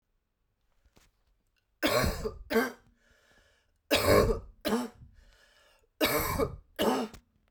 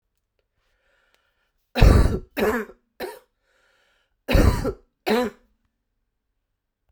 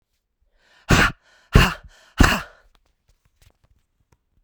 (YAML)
three_cough_length: 7.5 s
three_cough_amplitude: 9382
three_cough_signal_mean_std_ratio: 0.44
cough_length: 6.9 s
cough_amplitude: 32767
cough_signal_mean_std_ratio: 0.33
exhalation_length: 4.4 s
exhalation_amplitude: 32767
exhalation_signal_mean_std_ratio: 0.28
survey_phase: beta (2021-08-13 to 2022-03-07)
age: 45-64
gender: Female
wearing_mask: 'No'
symptom_cough_any: true
symptom_runny_or_blocked_nose: true
symptom_sore_throat: true
symptom_diarrhoea: true
symptom_fatigue: true
symptom_headache: true
smoker_status: Never smoked
respiratory_condition_asthma: true
respiratory_condition_other: false
recruitment_source: Test and Trace
submission_delay: 2 days
covid_test_result: Positive
covid_test_method: RT-qPCR
covid_ct_value: 18.1
covid_ct_gene: ORF1ab gene
covid_ct_mean: 18.8
covid_viral_load: 670000 copies/ml
covid_viral_load_category: Low viral load (10K-1M copies/ml)